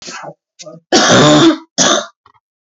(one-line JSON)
{"three_cough_length": "2.6 s", "three_cough_amplitude": 32767, "three_cough_signal_mean_std_ratio": 0.56, "survey_phase": "beta (2021-08-13 to 2022-03-07)", "age": "18-44", "gender": "Male", "wearing_mask": "No", "symptom_cough_any": true, "symptom_shortness_of_breath": true, "symptom_fatigue": true, "symptom_fever_high_temperature": true, "symptom_headache": true, "smoker_status": "Never smoked", "respiratory_condition_asthma": true, "respiratory_condition_other": false, "recruitment_source": "Test and Trace", "submission_delay": "3 days", "covid_test_result": "Positive", "covid_test_method": "LFT"}